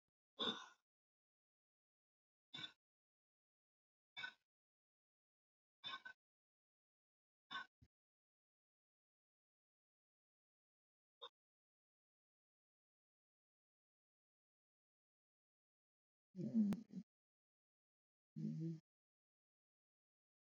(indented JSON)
{
  "exhalation_length": "20.5 s",
  "exhalation_amplitude": 1162,
  "exhalation_signal_mean_std_ratio": 0.21,
  "survey_phase": "alpha (2021-03-01 to 2021-08-12)",
  "age": "45-64",
  "gender": "Female",
  "wearing_mask": "No",
  "symptom_none": true,
  "smoker_status": "Never smoked",
  "respiratory_condition_asthma": false,
  "respiratory_condition_other": false,
  "recruitment_source": "REACT",
  "submission_delay": "4 days",
  "covid_test_result": "Negative",
  "covid_test_method": "RT-qPCR"
}